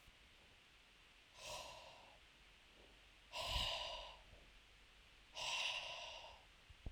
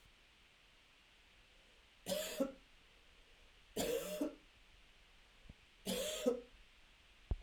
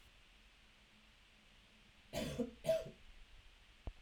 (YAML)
exhalation_length: 6.9 s
exhalation_amplitude: 1163
exhalation_signal_mean_std_ratio: 0.56
three_cough_length: 7.4 s
three_cough_amplitude: 2677
three_cough_signal_mean_std_ratio: 0.43
cough_length: 4.0 s
cough_amplitude: 1718
cough_signal_mean_std_ratio: 0.4
survey_phase: alpha (2021-03-01 to 2021-08-12)
age: 18-44
gender: Male
wearing_mask: 'No'
symptom_cough_any: true
symptom_fatigue: true
symptom_fever_high_temperature: true
symptom_headache: true
symptom_loss_of_taste: true
symptom_onset: 5 days
smoker_status: Never smoked
respiratory_condition_asthma: false
respiratory_condition_other: false
recruitment_source: Test and Trace
submission_delay: 2 days
covid_test_result: Positive
covid_test_method: RT-qPCR
covid_ct_value: 13.0
covid_ct_gene: ORF1ab gene
covid_ct_mean: 13.5
covid_viral_load: 37000000 copies/ml
covid_viral_load_category: High viral load (>1M copies/ml)